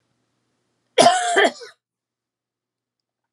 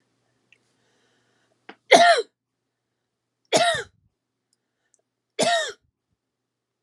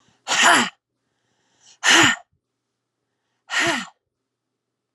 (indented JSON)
{
  "cough_length": "3.3 s",
  "cough_amplitude": 31240,
  "cough_signal_mean_std_ratio": 0.31,
  "three_cough_length": "6.8 s",
  "three_cough_amplitude": 31395,
  "three_cough_signal_mean_std_ratio": 0.27,
  "exhalation_length": "4.9 s",
  "exhalation_amplitude": 27875,
  "exhalation_signal_mean_std_ratio": 0.35,
  "survey_phase": "beta (2021-08-13 to 2022-03-07)",
  "age": "45-64",
  "gender": "Female",
  "wearing_mask": "No",
  "symptom_headache": true,
  "smoker_status": "Never smoked",
  "respiratory_condition_asthma": true,
  "respiratory_condition_other": false,
  "recruitment_source": "REACT",
  "submission_delay": "0 days",
  "covid_test_result": "Negative",
  "covid_test_method": "RT-qPCR",
  "influenza_a_test_result": "Unknown/Void",
  "influenza_b_test_result": "Unknown/Void"
}